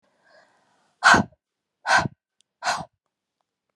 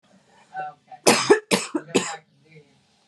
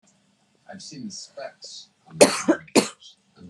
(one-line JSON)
{"exhalation_length": "3.8 s", "exhalation_amplitude": 27447, "exhalation_signal_mean_std_ratio": 0.28, "three_cough_length": "3.1 s", "three_cough_amplitude": 31935, "three_cough_signal_mean_std_ratio": 0.36, "cough_length": "3.5 s", "cough_amplitude": 32277, "cough_signal_mean_std_ratio": 0.29, "survey_phase": "beta (2021-08-13 to 2022-03-07)", "age": "18-44", "gender": "Female", "wearing_mask": "No", "symptom_cough_any": true, "symptom_new_continuous_cough": true, "symptom_runny_or_blocked_nose": true, "symptom_sore_throat": true, "symptom_headache": true, "symptom_loss_of_taste": true, "symptom_other": true, "symptom_onset": "9 days", "smoker_status": "Ex-smoker", "respiratory_condition_asthma": false, "respiratory_condition_other": false, "recruitment_source": "Test and Trace", "submission_delay": "2 days", "covid_test_result": "Positive", "covid_test_method": "RT-qPCR", "covid_ct_value": 13.6, "covid_ct_gene": "S gene", "covid_ct_mean": 13.9, "covid_viral_load": "27000000 copies/ml", "covid_viral_load_category": "High viral load (>1M copies/ml)"}